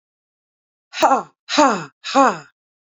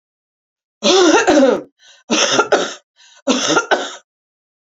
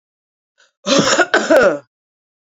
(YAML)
exhalation_length: 3.0 s
exhalation_amplitude: 28216
exhalation_signal_mean_std_ratio: 0.36
three_cough_length: 4.8 s
three_cough_amplitude: 29762
three_cough_signal_mean_std_ratio: 0.52
cough_length: 2.6 s
cough_amplitude: 32768
cough_signal_mean_std_ratio: 0.46
survey_phase: beta (2021-08-13 to 2022-03-07)
age: 18-44
gender: Female
wearing_mask: 'No'
symptom_none: true
smoker_status: Current smoker (11 or more cigarettes per day)
respiratory_condition_asthma: false
respiratory_condition_other: false
recruitment_source: REACT
submission_delay: 2 days
covid_test_result: Negative
covid_test_method: RT-qPCR
influenza_a_test_result: Negative
influenza_b_test_result: Negative